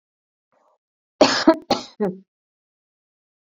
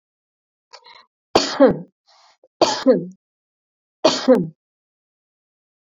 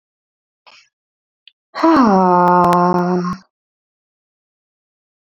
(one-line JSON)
{"cough_length": "3.5 s", "cough_amplitude": 27375, "cough_signal_mean_std_ratio": 0.27, "three_cough_length": "5.8 s", "three_cough_amplitude": 30324, "three_cough_signal_mean_std_ratio": 0.31, "exhalation_length": "5.4 s", "exhalation_amplitude": 29586, "exhalation_signal_mean_std_ratio": 0.43, "survey_phase": "beta (2021-08-13 to 2022-03-07)", "age": "18-44", "gender": "Female", "wearing_mask": "No", "symptom_none": true, "smoker_status": "Never smoked", "respiratory_condition_asthma": false, "respiratory_condition_other": false, "recruitment_source": "REACT", "submission_delay": "3 days", "covid_test_result": "Negative", "covid_test_method": "RT-qPCR"}